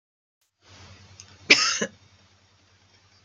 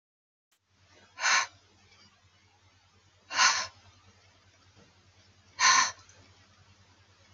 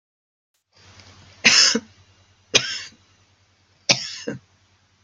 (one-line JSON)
{"cough_length": "3.2 s", "cough_amplitude": 29910, "cough_signal_mean_std_ratio": 0.24, "exhalation_length": "7.3 s", "exhalation_amplitude": 12375, "exhalation_signal_mean_std_ratio": 0.29, "three_cough_length": "5.0 s", "three_cough_amplitude": 32768, "three_cough_signal_mean_std_ratio": 0.29, "survey_phase": "alpha (2021-03-01 to 2021-08-12)", "age": "65+", "gender": "Female", "wearing_mask": "No", "symptom_none": true, "smoker_status": "Never smoked", "respiratory_condition_asthma": true, "respiratory_condition_other": false, "recruitment_source": "REACT", "submission_delay": "3 days", "covid_test_result": "Negative", "covid_test_method": "RT-qPCR"}